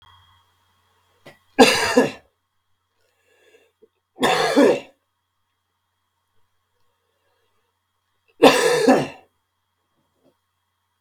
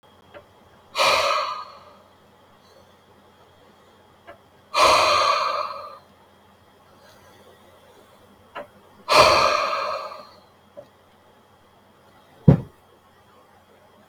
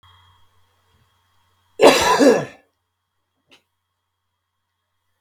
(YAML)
three_cough_length: 11.0 s
three_cough_amplitude: 32768
three_cough_signal_mean_std_ratio: 0.29
exhalation_length: 14.1 s
exhalation_amplitude: 31741
exhalation_signal_mean_std_ratio: 0.35
cough_length: 5.2 s
cough_amplitude: 32768
cough_signal_mean_std_ratio: 0.27
survey_phase: beta (2021-08-13 to 2022-03-07)
age: 45-64
gender: Male
wearing_mask: 'No'
symptom_none: true
smoker_status: Never smoked
respiratory_condition_asthma: false
respiratory_condition_other: false
recruitment_source: REACT
submission_delay: 2 days
covid_test_result: Negative
covid_test_method: RT-qPCR